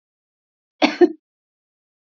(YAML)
cough_length: 2.0 s
cough_amplitude: 28637
cough_signal_mean_std_ratio: 0.22
survey_phase: beta (2021-08-13 to 2022-03-07)
age: 45-64
gender: Female
wearing_mask: 'No'
symptom_none: true
symptom_onset: 12 days
smoker_status: Never smoked
respiratory_condition_asthma: false
respiratory_condition_other: false
recruitment_source: REACT
submission_delay: 3 days
covid_test_result: Negative
covid_test_method: RT-qPCR
influenza_a_test_result: Negative
influenza_b_test_result: Negative